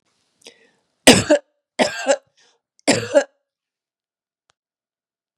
{"three_cough_length": "5.4 s", "three_cough_amplitude": 32768, "three_cough_signal_mean_std_ratio": 0.27, "survey_phase": "beta (2021-08-13 to 2022-03-07)", "age": "45-64", "gender": "Female", "wearing_mask": "No", "symptom_cough_any": true, "smoker_status": "Never smoked", "respiratory_condition_asthma": false, "respiratory_condition_other": false, "recruitment_source": "REACT", "submission_delay": "1 day", "covid_test_result": "Negative", "covid_test_method": "RT-qPCR", "influenza_a_test_result": "Negative", "influenza_b_test_result": "Negative"}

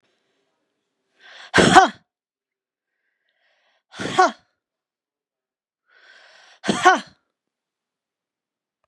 {"cough_length": "8.9 s", "cough_amplitude": 32768, "cough_signal_mean_std_ratio": 0.22, "survey_phase": "beta (2021-08-13 to 2022-03-07)", "age": "65+", "gender": "Female", "wearing_mask": "No", "symptom_none": true, "symptom_onset": "12 days", "smoker_status": "Ex-smoker", "respiratory_condition_asthma": false, "respiratory_condition_other": false, "recruitment_source": "REACT", "submission_delay": "3 days", "covid_test_result": "Negative", "covid_test_method": "RT-qPCR", "influenza_a_test_result": "Negative", "influenza_b_test_result": "Negative"}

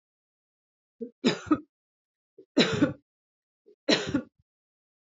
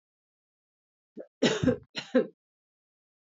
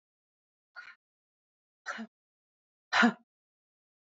{"three_cough_length": "5.0 s", "three_cough_amplitude": 17460, "three_cough_signal_mean_std_ratio": 0.31, "cough_length": "3.3 s", "cough_amplitude": 9740, "cough_signal_mean_std_ratio": 0.29, "exhalation_length": "4.0 s", "exhalation_amplitude": 7561, "exhalation_signal_mean_std_ratio": 0.21, "survey_phase": "beta (2021-08-13 to 2022-03-07)", "age": "45-64", "gender": "Female", "wearing_mask": "No", "symptom_none": true, "smoker_status": "Never smoked", "respiratory_condition_asthma": false, "respiratory_condition_other": false, "recruitment_source": "REACT", "submission_delay": "0 days", "covid_test_result": "Negative", "covid_test_method": "RT-qPCR", "influenza_a_test_result": "Negative", "influenza_b_test_result": "Negative"}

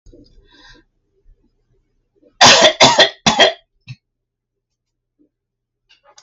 {"cough_length": "6.2 s", "cough_amplitude": 32768, "cough_signal_mean_std_ratio": 0.3, "survey_phase": "alpha (2021-03-01 to 2021-08-12)", "age": "65+", "gender": "Female", "wearing_mask": "No", "symptom_none": true, "smoker_status": "Ex-smoker", "respiratory_condition_asthma": false, "respiratory_condition_other": false, "recruitment_source": "REACT", "submission_delay": "3 days", "covid_test_result": "Negative", "covid_test_method": "RT-qPCR"}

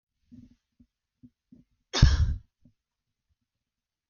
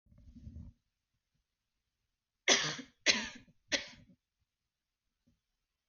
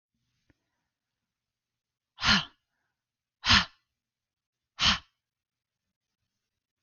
{"cough_length": "4.1 s", "cough_amplitude": 25273, "cough_signal_mean_std_ratio": 0.22, "three_cough_length": "5.9 s", "three_cough_amplitude": 9726, "three_cough_signal_mean_std_ratio": 0.25, "exhalation_length": "6.8 s", "exhalation_amplitude": 14423, "exhalation_signal_mean_std_ratio": 0.22, "survey_phase": "beta (2021-08-13 to 2022-03-07)", "age": "18-44", "gender": "Female", "wearing_mask": "No", "symptom_none": true, "smoker_status": "Never smoked", "respiratory_condition_asthma": false, "respiratory_condition_other": false, "recruitment_source": "REACT", "submission_delay": "1 day", "covid_test_result": "Negative", "covid_test_method": "RT-qPCR", "influenza_a_test_result": "Negative", "influenza_b_test_result": "Negative"}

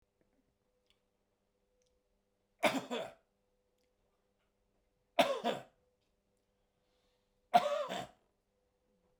{"three_cough_length": "9.2 s", "three_cough_amplitude": 7244, "three_cough_signal_mean_std_ratio": 0.25, "survey_phase": "beta (2021-08-13 to 2022-03-07)", "age": "65+", "gender": "Male", "wearing_mask": "No", "symptom_none": true, "smoker_status": "Ex-smoker", "respiratory_condition_asthma": false, "respiratory_condition_other": false, "recruitment_source": "REACT", "submission_delay": "3 days", "covid_test_result": "Negative", "covid_test_method": "RT-qPCR", "influenza_a_test_result": "Negative", "influenza_b_test_result": "Negative"}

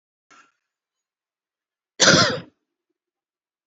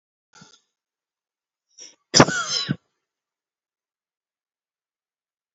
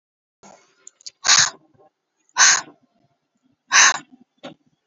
{"cough_length": "3.7 s", "cough_amplitude": 29799, "cough_signal_mean_std_ratio": 0.24, "three_cough_length": "5.5 s", "three_cough_amplitude": 32767, "three_cough_signal_mean_std_ratio": 0.19, "exhalation_length": "4.9 s", "exhalation_amplitude": 32767, "exhalation_signal_mean_std_ratio": 0.3, "survey_phase": "beta (2021-08-13 to 2022-03-07)", "age": "18-44", "gender": "Female", "wearing_mask": "No", "symptom_cough_any": true, "symptom_runny_or_blocked_nose": true, "symptom_shortness_of_breath": true, "symptom_sore_throat": true, "symptom_fatigue": true, "symptom_headache": true, "smoker_status": "Never smoked", "respiratory_condition_asthma": false, "respiratory_condition_other": false, "recruitment_source": "Test and Trace", "submission_delay": "3 days", "covid_test_result": "Positive", "covid_test_method": "LFT"}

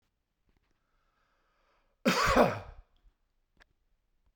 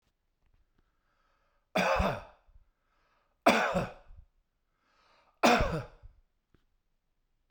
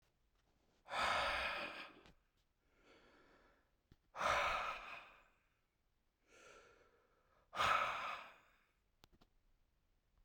{"cough_length": "4.4 s", "cough_amplitude": 9073, "cough_signal_mean_std_ratio": 0.27, "three_cough_length": "7.5 s", "three_cough_amplitude": 11989, "three_cough_signal_mean_std_ratio": 0.32, "exhalation_length": "10.2 s", "exhalation_amplitude": 2309, "exhalation_signal_mean_std_ratio": 0.4, "survey_phase": "beta (2021-08-13 to 2022-03-07)", "age": "65+", "gender": "Male", "wearing_mask": "No", "symptom_none": true, "smoker_status": "Ex-smoker", "respiratory_condition_asthma": false, "respiratory_condition_other": false, "recruitment_source": "REACT", "submission_delay": "1 day", "covid_test_result": "Negative", "covid_test_method": "RT-qPCR"}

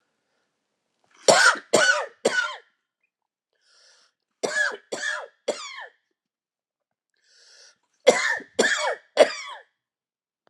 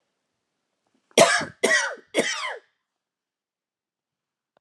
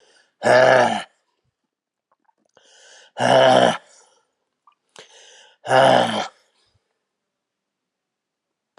{"three_cough_length": "10.5 s", "three_cough_amplitude": 30329, "three_cough_signal_mean_std_ratio": 0.34, "cough_length": "4.6 s", "cough_amplitude": 27077, "cough_signal_mean_std_ratio": 0.31, "exhalation_length": "8.8 s", "exhalation_amplitude": 29855, "exhalation_signal_mean_std_ratio": 0.35, "survey_phase": "alpha (2021-03-01 to 2021-08-12)", "age": "45-64", "gender": "Male", "wearing_mask": "No", "symptom_new_continuous_cough": true, "symptom_fever_high_temperature": true, "symptom_headache": true, "smoker_status": "Never smoked", "respiratory_condition_asthma": false, "respiratory_condition_other": false, "recruitment_source": "Test and Trace", "submission_delay": "2 days", "covid_test_result": "Positive", "covid_test_method": "RT-qPCR", "covid_ct_value": 18.8, "covid_ct_gene": "ORF1ab gene", "covid_ct_mean": 19.2, "covid_viral_load": "510000 copies/ml", "covid_viral_load_category": "Low viral load (10K-1M copies/ml)"}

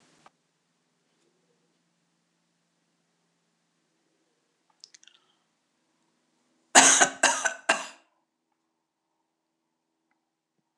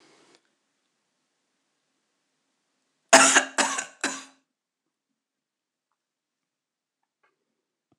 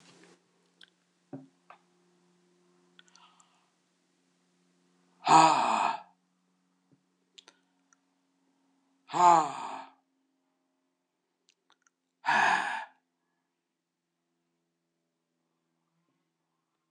{"three_cough_length": "10.8 s", "three_cough_amplitude": 26028, "three_cough_signal_mean_std_ratio": 0.18, "cough_length": "8.0 s", "cough_amplitude": 26028, "cough_signal_mean_std_ratio": 0.19, "exhalation_length": "16.9 s", "exhalation_amplitude": 13377, "exhalation_signal_mean_std_ratio": 0.23, "survey_phase": "alpha (2021-03-01 to 2021-08-12)", "age": "65+", "gender": "Female", "wearing_mask": "No", "symptom_cough_any": true, "symptom_fatigue": true, "symptom_fever_high_temperature": true, "symptom_onset": "3 days", "smoker_status": "Never smoked", "respiratory_condition_asthma": false, "respiratory_condition_other": false, "recruitment_source": "Test and Trace", "submission_delay": "2 days", "covid_test_result": "Positive", "covid_test_method": "RT-qPCR", "covid_ct_value": 25.5, "covid_ct_gene": "ORF1ab gene", "covid_ct_mean": 26.0, "covid_viral_load": "3000 copies/ml", "covid_viral_load_category": "Minimal viral load (< 10K copies/ml)"}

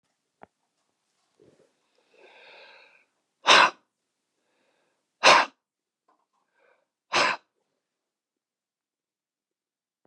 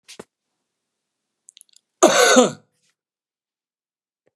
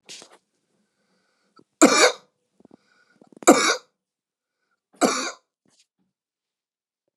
{"exhalation_length": "10.1 s", "exhalation_amplitude": 23072, "exhalation_signal_mean_std_ratio": 0.2, "cough_length": "4.4 s", "cough_amplitude": 31699, "cough_signal_mean_std_ratio": 0.26, "three_cough_length": "7.2 s", "three_cough_amplitude": 32761, "three_cough_signal_mean_std_ratio": 0.24, "survey_phase": "beta (2021-08-13 to 2022-03-07)", "age": "65+", "gender": "Male", "wearing_mask": "No", "symptom_change_to_sense_of_smell_or_taste": true, "symptom_onset": "8 days", "smoker_status": "Never smoked", "respiratory_condition_asthma": false, "respiratory_condition_other": false, "recruitment_source": "Test and Trace", "submission_delay": "2 days", "covid_test_result": "Positive", "covid_test_method": "RT-qPCR", "covid_ct_value": 23.3, "covid_ct_gene": "N gene"}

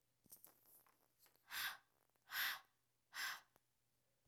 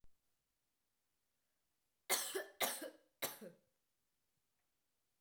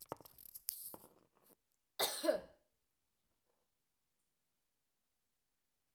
{"exhalation_length": "4.3 s", "exhalation_amplitude": 905, "exhalation_signal_mean_std_ratio": 0.37, "three_cough_length": "5.2 s", "three_cough_amplitude": 3157, "three_cough_signal_mean_std_ratio": 0.29, "cough_length": "5.9 s", "cough_amplitude": 5635, "cough_signal_mean_std_ratio": 0.23, "survey_phase": "beta (2021-08-13 to 2022-03-07)", "age": "18-44", "gender": "Female", "wearing_mask": "No", "symptom_cough_any": true, "symptom_new_continuous_cough": true, "symptom_runny_or_blocked_nose": true, "symptom_shortness_of_breath": true, "symptom_sore_throat": true, "symptom_fatigue": true, "symptom_fever_high_temperature": true, "symptom_change_to_sense_of_smell_or_taste": true, "symptom_loss_of_taste": true, "symptom_onset": "2 days", "smoker_status": "Never smoked", "respiratory_condition_asthma": false, "respiratory_condition_other": false, "recruitment_source": "Test and Trace", "submission_delay": "1 day", "covid_test_result": "Positive", "covid_test_method": "RT-qPCR", "covid_ct_value": 25.4, "covid_ct_gene": "ORF1ab gene"}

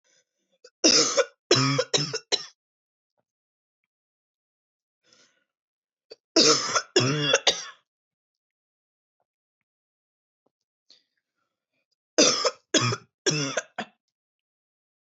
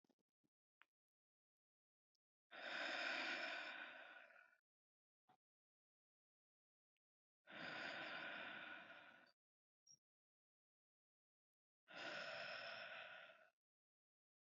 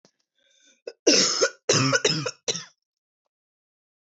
{"three_cough_length": "15.0 s", "three_cough_amplitude": 17777, "three_cough_signal_mean_std_ratio": 0.33, "exhalation_length": "14.4 s", "exhalation_amplitude": 664, "exhalation_signal_mean_std_ratio": 0.45, "cough_length": "4.2 s", "cough_amplitude": 18446, "cough_signal_mean_std_ratio": 0.4, "survey_phase": "beta (2021-08-13 to 2022-03-07)", "age": "18-44", "gender": "Female", "wearing_mask": "No", "symptom_cough_any": true, "symptom_new_continuous_cough": true, "symptom_shortness_of_breath": true, "symptom_sore_throat": true, "symptom_headache": true, "smoker_status": "Never smoked", "respiratory_condition_asthma": false, "respiratory_condition_other": false, "recruitment_source": "Test and Trace", "submission_delay": "1 day", "covid_test_result": "Positive", "covid_test_method": "RT-qPCR", "covid_ct_value": 32.0, "covid_ct_gene": "N gene"}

